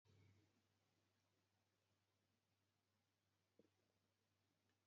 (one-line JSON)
{"exhalation_length": "4.9 s", "exhalation_amplitude": 34, "exhalation_signal_mean_std_ratio": 0.66, "survey_phase": "beta (2021-08-13 to 2022-03-07)", "age": "65+", "gender": "Female", "wearing_mask": "No", "symptom_change_to_sense_of_smell_or_taste": true, "symptom_loss_of_taste": true, "smoker_status": "Never smoked", "respiratory_condition_asthma": false, "respiratory_condition_other": false, "recruitment_source": "REACT", "submission_delay": "0 days", "covid_test_result": "Negative", "covid_test_method": "RT-qPCR", "influenza_a_test_result": "Negative", "influenza_b_test_result": "Negative"}